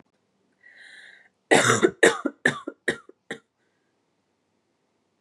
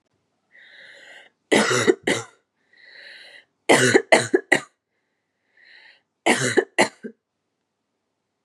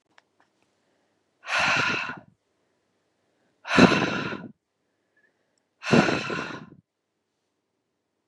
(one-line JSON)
{"cough_length": "5.2 s", "cough_amplitude": 30825, "cough_signal_mean_std_ratio": 0.28, "three_cough_length": "8.4 s", "three_cough_amplitude": 31035, "three_cough_signal_mean_std_ratio": 0.33, "exhalation_length": "8.3 s", "exhalation_amplitude": 25732, "exhalation_signal_mean_std_ratio": 0.33, "survey_phase": "beta (2021-08-13 to 2022-03-07)", "age": "18-44", "gender": "Female", "wearing_mask": "No", "symptom_sore_throat": true, "symptom_fatigue": true, "symptom_headache": true, "smoker_status": "Current smoker (1 to 10 cigarettes per day)", "respiratory_condition_asthma": false, "respiratory_condition_other": false, "recruitment_source": "Test and Trace", "submission_delay": "2 days", "covid_test_result": "Positive", "covid_test_method": "RT-qPCR", "covid_ct_value": 25.6, "covid_ct_gene": "N gene"}